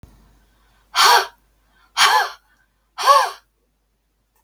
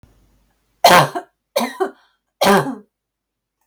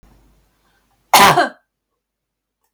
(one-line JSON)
{"exhalation_length": "4.4 s", "exhalation_amplitude": 32768, "exhalation_signal_mean_std_ratio": 0.36, "three_cough_length": "3.7 s", "three_cough_amplitude": 32768, "three_cough_signal_mean_std_ratio": 0.35, "cough_length": "2.7 s", "cough_amplitude": 32768, "cough_signal_mean_std_ratio": 0.28, "survey_phase": "beta (2021-08-13 to 2022-03-07)", "age": "45-64", "gender": "Female", "wearing_mask": "No", "symptom_none": true, "smoker_status": "Ex-smoker", "respiratory_condition_asthma": false, "respiratory_condition_other": false, "recruitment_source": "REACT", "submission_delay": "2 days", "covid_test_result": "Negative", "covid_test_method": "RT-qPCR", "influenza_a_test_result": "Negative", "influenza_b_test_result": "Negative"}